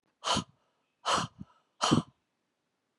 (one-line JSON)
{"exhalation_length": "3.0 s", "exhalation_amplitude": 10621, "exhalation_signal_mean_std_ratio": 0.35, "survey_phase": "beta (2021-08-13 to 2022-03-07)", "age": "65+", "gender": "Female", "wearing_mask": "No", "symptom_none": true, "smoker_status": "Never smoked", "respiratory_condition_asthma": false, "respiratory_condition_other": false, "recruitment_source": "REACT", "submission_delay": "1 day", "covid_test_result": "Negative", "covid_test_method": "RT-qPCR", "influenza_a_test_result": "Negative", "influenza_b_test_result": "Negative"}